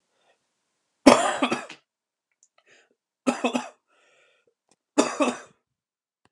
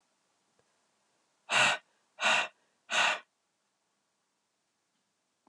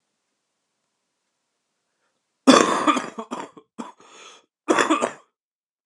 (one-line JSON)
{"three_cough_length": "6.3 s", "three_cough_amplitude": 32767, "three_cough_signal_mean_std_ratio": 0.26, "exhalation_length": "5.5 s", "exhalation_amplitude": 6656, "exhalation_signal_mean_std_ratio": 0.31, "cough_length": "5.9 s", "cough_amplitude": 32607, "cough_signal_mean_std_ratio": 0.3, "survey_phase": "alpha (2021-03-01 to 2021-08-12)", "age": "18-44", "gender": "Female", "wearing_mask": "No", "symptom_cough_any": true, "symptom_new_continuous_cough": true, "symptom_abdominal_pain": true, "symptom_fatigue": true, "symptom_fever_high_temperature": true, "symptom_headache": true, "symptom_onset": "1 day", "smoker_status": "Never smoked", "respiratory_condition_asthma": false, "respiratory_condition_other": false, "recruitment_source": "Test and Trace", "submission_delay": "0 days", "covid_test_result": "Positive", "covid_test_method": "RT-qPCR", "covid_ct_value": 16.9, "covid_ct_gene": "ORF1ab gene", "covid_ct_mean": 17.3, "covid_viral_load": "2100000 copies/ml", "covid_viral_load_category": "High viral load (>1M copies/ml)"}